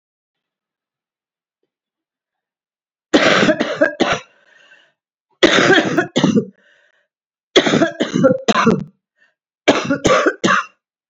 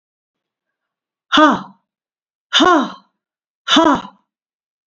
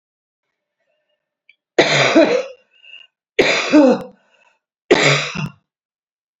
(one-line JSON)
{"cough_length": "11.1 s", "cough_amplitude": 29236, "cough_signal_mean_std_ratio": 0.45, "exhalation_length": "4.9 s", "exhalation_amplitude": 31233, "exhalation_signal_mean_std_ratio": 0.36, "three_cough_length": "6.4 s", "three_cough_amplitude": 32767, "three_cough_signal_mean_std_ratio": 0.41, "survey_phase": "beta (2021-08-13 to 2022-03-07)", "age": "65+", "gender": "Female", "wearing_mask": "No", "symptom_new_continuous_cough": true, "symptom_runny_or_blocked_nose": true, "symptom_shortness_of_breath": true, "symptom_sore_throat": true, "symptom_headache": true, "symptom_onset": "4 days", "smoker_status": "Ex-smoker", "respiratory_condition_asthma": false, "respiratory_condition_other": false, "recruitment_source": "Test and Trace", "submission_delay": "1 day", "covid_test_result": "Negative", "covid_test_method": "RT-qPCR"}